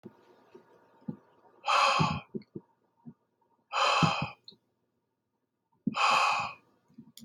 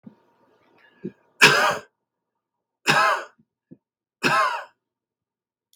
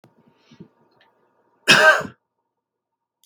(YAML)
exhalation_length: 7.2 s
exhalation_amplitude: 9577
exhalation_signal_mean_std_ratio: 0.41
three_cough_length: 5.8 s
three_cough_amplitude: 32768
three_cough_signal_mean_std_ratio: 0.33
cough_length: 3.3 s
cough_amplitude: 32768
cough_signal_mean_std_ratio: 0.26
survey_phase: beta (2021-08-13 to 2022-03-07)
age: 18-44
gender: Male
wearing_mask: 'No'
symptom_none: true
smoker_status: Ex-smoker
respiratory_condition_asthma: false
respiratory_condition_other: false
recruitment_source: REACT
submission_delay: 2 days
covid_test_result: Negative
covid_test_method: RT-qPCR
influenza_a_test_result: Negative
influenza_b_test_result: Negative